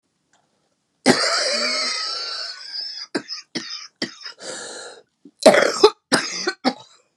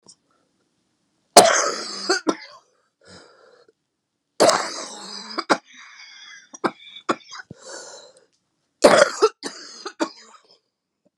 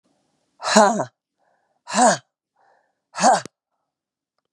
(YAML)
cough_length: 7.2 s
cough_amplitude: 32767
cough_signal_mean_std_ratio: 0.44
three_cough_length: 11.2 s
three_cough_amplitude: 32768
three_cough_signal_mean_std_ratio: 0.3
exhalation_length: 4.5 s
exhalation_amplitude: 32747
exhalation_signal_mean_std_ratio: 0.33
survey_phase: beta (2021-08-13 to 2022-03-07)
age: 45-64
gender: Female
wearing_mask: 'No'
symptom_cough_any: true
symptom_new_continuous_cough: true
symptom_runny_or_blocked_nose: true
symptom_diarrhoea: true
symptom_fatigue: true
symptom_headache: true
symptom_other: true
symptom_onset: 3 days
smoker_status: Never smoked
respiratory_condition_asthma: true
respiratory_condition_other: false
recruitment_source: Test and Trace
submission_delay: 1 day
covid_test_result: Positive
covid_test_method: ePCR